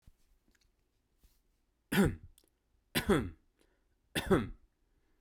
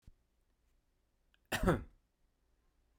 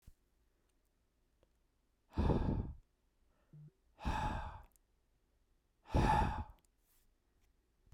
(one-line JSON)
{"three_cough_length": "5.2 s", "three_cough_amplitude": 5088, "three_cough_signal_mean_std_ratio": 0.3, "cough_length": "3.0 s", "cough_amplitude": 4569, "cough_signal_mean_std_ratio": 0.24, "exhalation_length": "7.9 s", "exhalation_amplitude": 3413, "exhalation_signal_mean_std_ratio": 0.36, "survey_phase": "beta (2021-08-13 to 2022-03-07)", "age": "18-44", "gender": "Male", "wearing_mask": "No", "symptom_none": true, "smoker_status": "Never smoked", "respiratory_condition_asthma": false, "respiratory_condition_other": false, "recruitment_source": "REACT", "submission_delay": "1 day", "covid_test_result": "Negative", "covid_test_method": "RT-qPCR"}